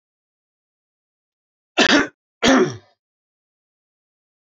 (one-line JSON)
{"cough_length": "4.4 s", "cough_amplitude": 26884, "cough_signal_mean_std_ratio": 0.28, "survey_phase": "beta (2021-08-13 to 2022-03-07)", "age": "65+", "gender": "Male", "wearing_mask": "No", "symptom_runny_or_blocked_nose": true, "symptom_headache": true, "symptom_onset": "8 days", "smoker_status": "Never smoked", "respiratory_condition_asthma": false, "respiratory_condition_other": false, "recruitment_source": "REACT", "submission_delay": "1 day", "covid_test_result": "Negative", "covid_test_method": "RT-qPCR"}